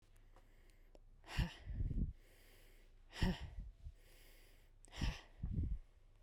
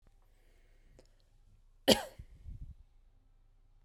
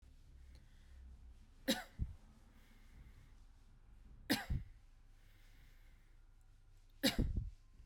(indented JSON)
{
  "exhalation_length": "6.2 s",
  "exhalation_amplitude": 2391,
  "exhalation_signal_mean_std_ratio": 0.51,
  "cough_length": "3.8 s",
  "cough_amplitude": 15116,
  "cough_signal_mean_std_ratio": 0.2,
  "three_cough_length": "7.9 s",
  "three_cough_amplitude": 3803,
  "three_cough_signal_mean_std_ratio": 0.39,
  "survey_phase": "beta (2021-08-13 to 2022-03-07)",
  "age": "18-44",
  "gender": "Female",
  "wearing_mask": "No",
  "symptom_runny_or_blocked_nose": true,
  "symptom_sore_throat": true,
  "symptom_fatigue": true,
  "symptom_headache": true,
  "symptom_onset": "6 days",
  "smoker_status": "Ex-smoker",
  "respiratory_condition_asthma": false,
  "respiratory_condition_other": false,
  "recruitment_source": "REACT",
  "submission_delay": "1 day",
  "covid_test_result": "Negative",
  "covid_test_method": "RT-qPCR",
  "influenza_a_test_result": "Negative",
  "influenza_b_test_result": "Negative"
}